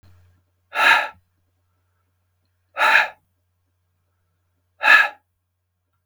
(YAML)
exhalation_length: 6.1 s
exhalation_amplitude: 32768
exhalation_signal_mean_std_ratio: 0.29
survey_phase: beta (2021-08-13 to 2022-03-07)
age: 65+
gender: Male
wearing_mask: 'No'
symptom_none: true
smoker_status: Ex-smoker
respiratory_condition_asthma: false
respiratory_condition_other: true
recruitment_source: REACT
submission_delay: 4 days
covid_test_result: Negative
covid_test_method: RT-qPCR